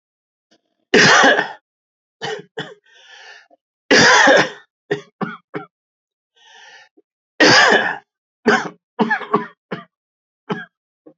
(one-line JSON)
{"three_cough_length": "11.2 s", "three_cough_amplitude": 30492, "three_cough_signal_mean_std_ratio": 0.38, "survey_phase": "beta (2021-08-13 to 2022-03-07)", "age": "45-64", "gender": "Male", "wearing_mask": "No", "symptom_cough_any": true, "symptom_new_continuous_cough": true, "symptom_runny_or_blocked_nose": true, "symptom_sore_throat": true, "symptom_diarrhoea": true, "symptom_headache": true, "symptom_change_to_sense_of_smell_or_taste": true, "symptom_onset": "2 days", "smoker_status": "Never smoked", "respiratory_condition_asthma": false, "respiratory_condition_other": false, "recruitment_source": "Test and Trace", "submission_delay": "1 day", "covid_test_result": "Positive", "covid_test_method": "RT-qPCR", "covid_ct_value": 17.1, "covid_ct_gene": "ORF1ab gene", "covid_ct_mean": 17.4, "covid_viral_load": "2000000 copies/ml", "covid_viral_load_category": "High viral load (>1M copies/ml)"}